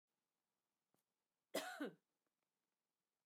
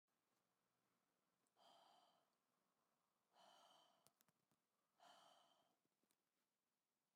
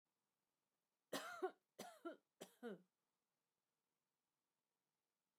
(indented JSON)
{
  "cough_length": "3.3 s",
  "cough_amplitude": 1161,
  "cough_signal_mean_std_ratio": 0.25,
  "exhalation_length": "7.2 s",
  "exhalation_amplitude": 125,
  "exhalation_signal_mean_std_ratio": 0.54,
  "three_cough_length": "5.4 s",
  "three_cough_amplitude": 670,
  "three_cough_signal_mean_std_ratio": 0.28,
  "survey_phase": "beta (2021-08-13 to 2022-03-07)",
  "age": "45-64",
  "gender": "Female",
  "wearing_mask": "No",
  "symptom_none": true,
  "smoker_status": "Never smoked",
  "respiratory_condition_asthma": false,
  "respiratory_condition_other": false,
  "recruitment_source": "REACT",
  "submission_delay": "2 days",
  "covid_test_result": "Negative",
  "covid_test_method": "RT-qPCR",
  "influenza_a_test_result": "Negative",
  "influenza_b_test_result": "Negative"
}